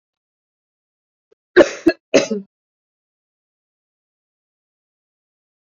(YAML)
cough_length: 5.7 s
cough_amplitude: 28190
cough_signal_mean_std_ratio: 0.18
survey_phase: beta (2021-08-13 to 2022-03-07)
age: 45-64
gender: Female
wearing_mask: 'Yes'
symptom_cough_any: true
symptom_runny_or_blocked_nose: true
symptom_shortness_of_breath: true
symptom_fatigue: true
symptom_headache: true
symptom_change_to_sense_of_smell_or_taste: true
smoker_status: Never smoked
respiratory_condition_asthma: false
respiratory_condition_other: false
recruitment_source: Test and Trace
submission_delay: 1 day
covid_test_result: Positive
covid_test_method: RT-qPCR
covid_ct_value: 17.3
covid_ct_gene: ORF1ab gene
covid_ct_mean: 17.8
covid_viral_load: 1400000 copies/ml
covid_viral_load_category: High viral load (>1M copies/ml)